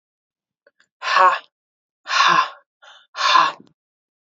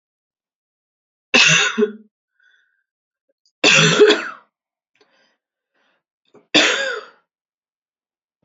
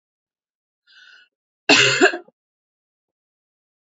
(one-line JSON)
{"exhalation_length": "4.4 s", "exhalation_amplitude": 26957, "exhalation_signal_mean_std_ratio": 0.39, "three_cough_length": "8.4 s", "three_cough_amplitude": 32768, "three_cough_signal_mean_std_ratio": 0.33, "cough_length": "3.8 s", "cough_amplitude": 30714, "cough_signal_mean_std_ratio": 0.26, "survey_phase": "beta (2021-08-13 to 2022-03-07)", "age": "18-44", "gender": "Female", "wearing_mask": "No", "symptom_new_continuous_cough": true, "symptom_runny_or_blocked_nose": true, "symptom_shortness_of_breath": true, "symptom_sore_throat": true, "symptom_abdominal_pain": true, "symptom_fatigue": true, "symptom_headache": true, "symptom_onset": "3 days", "smoker_status": "Never smoked", "respiratory_condition_asthma": false, "respiratory_condition_other": false, "recruitment_source": "Test and Trace", "submission_delay": "1 day", "covid_test_result": "Positive", "covid_test_method": "RT-qPCR", "covid_ct_value": 28.0, "covid_ct_gene": "ORF1ab gene", "covid_ct_mean": 28.0, "covid_viral_load": "640 copies/ml", "covid_viral_load_category": "Minimal viral load (< 10K copies/ml)"}